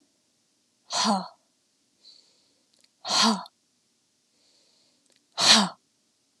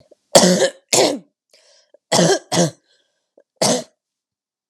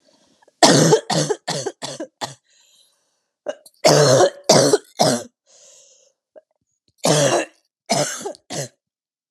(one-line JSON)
{"exhalation_length": "6.4 s", "exhalation_amplitude": 22512, "exhalation_signal_mean_std_ratio": 0.3, "three_cough_length": "4.7 s", "three_cough_amplitude": 32768, "three_cough_signal_mean_std_ratio": 0.4, "cough_length": "9.3 s", "cough_amplitude": 32768, "cough_signal_mean_std_ratio": 0.43, "survey_phase": "alpha (2021-03-01 to 2021-08-12)", "age": "18-44", "gender": "Female", "wearing_mask": "No", "symptom_cough_any": true, "symptom_new_continuous_cough": true, "symptom_fatigue": true, "symptom_headache": true, "smoker_status": "Never smoked", "respiratory_condition_asthma": false, "respiratory_condition_other": false, "recruitment_source": "Test and Trace", "submission_delay": "1 day", "covid_test_result": "Positive", "covid_test_method": "RT-qPCR"}